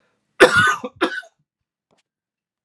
{"cough_length": "2.6 s", "cough_amplitude": 32768, "cough_signal_mean_std_ratio": 0.32, "survey_phase": "alpha (2021-03-01 to 2021-08-12)", "age": "45-64", "gender": "Male", "wearing_mask": "No", "symptom_none": true, "symptom_onset": "8 days", "smoker_status": "Never smoked", "respiratory_condition_asthma": false, "respiratory_condition_other": false, "recruitment_source": "REACT", "submission_delay": "3 days", "covid_test_result": "Negative", "covid_test_method": "RT-qPCR"}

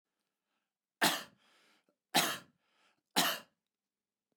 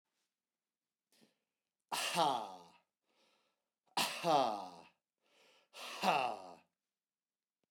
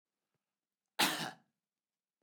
{"three_cough_length": "4.4 s", "three_cough_amplitude": 6493, "three_cough_signal_mean_std_ratio": 0.28, "exhalation_length": "7.7 s", "exhalation_amplitude": 4766, "exhalation_signal_mean_std_ratio": 0.35, "cough_length": "2.2 s", "cough_amplitude": 6997, "cough_signal_mean_std_ratio": 0.26, "survey_phase": "beta (2021-08-13 to 2022-03-07)", "age": "45-64", "gender": "Male", "wearing_mask": "No", "symptom_none": true, "smoker_status": "Never smoked", "respiratory_condition_asthma": false, "respiratory_condition_other": false, "recruitment_source": "REACT", "submission_delay": "3 days", "covid_test_result": "Negative", "covid_test_method": "RT-qPCR", "influenza_a_test_result": "Negative", "influenza_b_test_result": "Negative"}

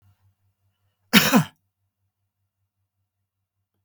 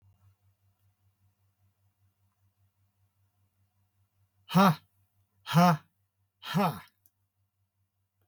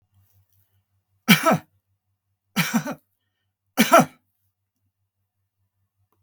{"cough_length": "3.8 s", "cough_amplitude": 32768, "cough_signal_mean_std_ratio": 0.21, "exhalation_length": "8.3 s", "exhalation_amplitude": 9207, "exhalation_signal_mean_std_ratio": 0.24, "three_cough_length": "6.2 s", "three_cough_amplitude": 32768, "three_cough_signal_mean_std_ratio": 0.25, "survey_phase": "beta (2021-08-13 to 2022-03-07)", "age": "65+", "gender": "Male", "wearing_mask": "No", "symptom_none": true, "smoker_status": "Ex-smoker", "respiratory_condition_asthma": false, "respiratory_condition_other": false, "recruitment_source": "REACT", "submission_delay": "2 days", "covid_test_result": "Negative", "covid_test_method": "RT-qPCR", "influenza_a_test_result": "Negative", "influenza_b_test_result": "Negative"}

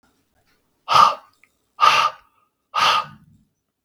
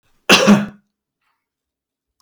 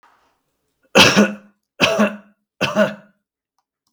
{"exhalation_length": "3.8 s", "exhalation_amplitude": 32768, "exhalation_signal_mean_std_ratio": 0.37, "cough_length": "2.2 s", "cough_amplitude": 32768, "cough_signal_mean_std_ratio": 0.32, "three_cough_length": "3.9 s", "three_cough_amplitude": 32768, "three_cough_signal_mean_std_ratio": 0.38, "survey_phase": "beta (2021-08-13 to 2022-03-07)", "age": "45-64", "gender": "Male", "wearing_mask": "No", "symptom_none": true, "smoker_status": "Never smoked", "respiratory_condition_asthma": false, "respiratory_condition_other": false, "recruitment_source": "REACT", "submission_delay": "1 day", "covid_test_result": "Negative", "covid_test_method": "RT-qPCR"}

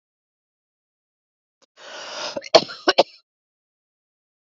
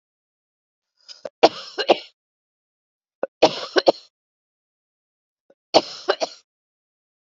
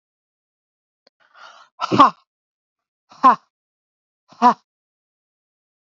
{"cough_length": "4.4 s", "cough_amplitude": 30179, "cough_signal_mean_std_ratio": 0.19, "three_cough_length": "7.3 s", "three_cough_amplitude": 30834, "three_cough_signal_mean_std_ratio": 0.21, "exhalation_length": "5.8 s", "exhalation_amplitude": 27766, "exhalation_signal_mean_std_ratio": 0.21, "survey_phase": "beta (2021-08-13 to 2022-03-07)", "age": "45-64", "gender": "Female", "wearing_mask": "No", "symptom_cough_any": true, "symptom_shortness_of_breath": true, "symptom_abdominal_pain": true, "symptom_fatigue": true, "symptom_headache": true, "symptom_change_to_sense_of_smell_or_taste": true, "symptom_loss_of_taste": true, "symptom_onset": "6 days", "smoker_status": "Current smoker (e-cigarettes or vapes only)", "respiratory_condition_asthma": false, "respiratory_condition_other": false, "recruitment_source": "Test and Trace", "submission_delay": "2 days", "covid_test_result": "Negative", "covid_test_method": "RT-qPCR"}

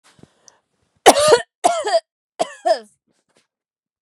{"three_cough_length": "4.0 s", "three_cough_amplitude": 32768, "three_cough_signal_mean_std_ratio": 0.33, "survey_phase": "beta (2021-08-13 to 2022-03-07)", "age": "18-44", "gender": "Female", "wearing_mask": "No", "symptom_none": true, "smoker_status": "Never smoked", "respiratory_condition_asthma": false, "respiratory_condition_other": false, "recruitment_source": "REACT", "submission_delay": "1 day", "covid_test_result": "Negative", "covid_test_method": "RT-qPCR", "influenza_a_test_result": "Negative", "influenza_b_test_result": "Negative"}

